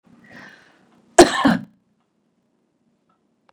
cough_length: 3.5 s
cough_amplitude: 32768
cough_signal_mean_std_ratio: 0.22
survey_phase: beta (2021-08-13 to 2022-03-07)
age: 65+
gender: Female
wearing_mask: 'No'
symptom_runny_or_blocked_nose: true
smoker_status: Ex-smoker
respiratory_condition_asthma: false
respiratory_condition_other: false
recruitment_source: REACT
submission_delay: 4 days
covid_test_result: Negative
covid_test_method: RT-qPCR
influenza_a_test_result: Negative
influenza_b_test_result: Negative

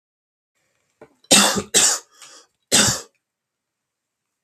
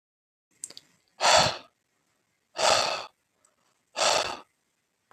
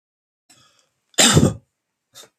three_cough_length: 4.4 s
three_cough_amplitude: 32766
three_cough_signal_mean_std_ratio: 0.33
exhalation_length: 5.1 s
exhalation_amplitude: 14101
exhalation_signal_mean_std_ratio: 0.35
cough_length: 2.4 s
cough_amplitude: 32767
cough_signal_mean_std_ratio: 0.3
survey_phase: beta (2021-08-13 to 2022-03-07)
age: 18-44
gender: Male
wearing_mask: 'No'
symptom_none: true
smoker_status: Never smoked
respiratory_condition_asthma: false
respiratory_condition_other: false
recruitment_source: Test and Trace
submission_delay: 4 days
covid_test_result: Negative
covid_test_method: RT-qPCR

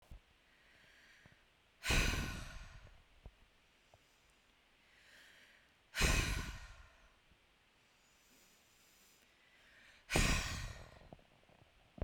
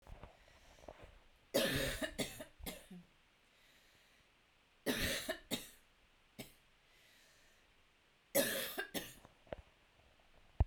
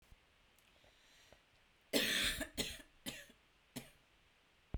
exhalation_length: 12.0 s
exhalation_amplitude: 4491
exhalation_signal_mean_std_ratio: 0.35
three_cough_length: 10.7 s
three_cough_amplitude: 3379
three_cough_signal_mean_std_ratio: 0.38
cough_length: 4.8 s
cough_amplitude: 3305
cough_signal_mean_std_ratio: 0.37
survey_phase: beta (2021-08-13 to 2022-03-07)
age: 18-44
gender: Female
wearing_mask: 'No'
symptom_runny_or_blocked_nose: true
symptom_sore_throat: true
symptom_fatigue: true
symptom_onset: 5 days
smoker_status: Never smoked
respiratory_condition_asthma: true
respiratory_condition_other: false
recruitment_source: REACT
submission_delay: 1 day
covid_test_result: Negative
covid_test_method: RT-qPCR
influenza_a_test_result: Negative
influenza_b_test_result: Negative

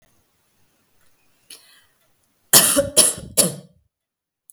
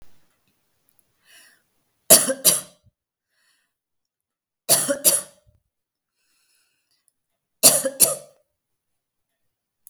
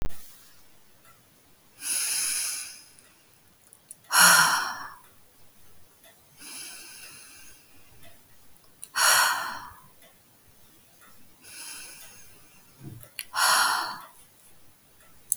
cough_length: 4.5 s
cough_amplitude: 32768
cough_signal_mean_std_ratio: 0.29
three_cough_length: 9.9 s
three_cough_amplitude: 32768
three_cough_signal_mean_std_ratio: 0.24
exhalation_length: 15.4 s
exhalation_amplitude: 24662
exhalation_signal_mean_std_ratio: 0.39
survey_phase: beta (2021-08-13 to 2022-03-07)
age: 45-64
gender: Female
wearing_mask: 'No'
symptom_runny_or_blocked_nose: true
symptom_sore_throat: true
smoker_status: Ex-smoker
respiratory_condition_asthma: false
respiratory_condition_other: false
recruitment_source: REACT
submission_delay: 1 day
covid_test_result: Negative
covid_test_method: RT-qPCR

